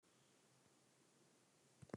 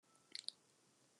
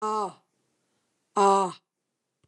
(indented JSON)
{
  "three_cough_length": "2.0 s",
  "three_cough_amplitude": 590,
  "three_cough_signal_mean_std_ratio": 0.34,
  "cough_length": "1.2 s",
  "cough_amplitude": 2196,
  "cough_signal_mean_std_ratio": 0.21,
  "exhalation_length": "2.5 s",
  "exhalation_amplitude": 11284,
  "exhalation_signal_mean_std_ratio": 0.38,
  "survey_phase": "alpha (2021-03-01 to 2021-08-12)",
  "age": "65+",
  "gender": "Female",
  "wearing_mask": "No",
  "symptom_none": true,
  "smoker_status": "Ex-smoker",
  "respiratory_condition_asthma": false,
  "respiratory_condition_other": false,
  "recruitment_source": "REACT",
  "submission_delay": "2 days",
  "covid_test_result": "Negative",
  "covid_test_method": "RT-qPCR"
}